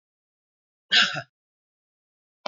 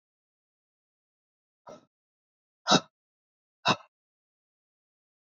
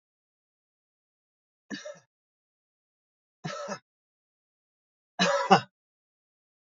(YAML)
cough_length: 2.5 s
cough_amplitude: 17564
cough_signal_mean_std_ratio: 0.24
exhalation_length: 5.2 s
exhalation_amplitude: 15465
exhalation_signal_mean_std_ratio: 0.16
three_cough_length: 6.7 s
three_cough_amplitude: 24047
three_cough_signal_mean_std_ratio: 0.21
survey_phase: beta (2021-08-13 to 2022-03-07)
age: 45-64
gender: Male
wearing_mask: 'No'
symptom_none: true
smoker_status: Never smoked
respiratory_condition_asthma: false
respiratory_condition_other: false
recruitment_source: REACT
submission_delay: 2 days
covid_test_result: Negative
covid_test_method: RT-qPCR
influenza_a_test_result: Negative
influenza_b_test_result: Negative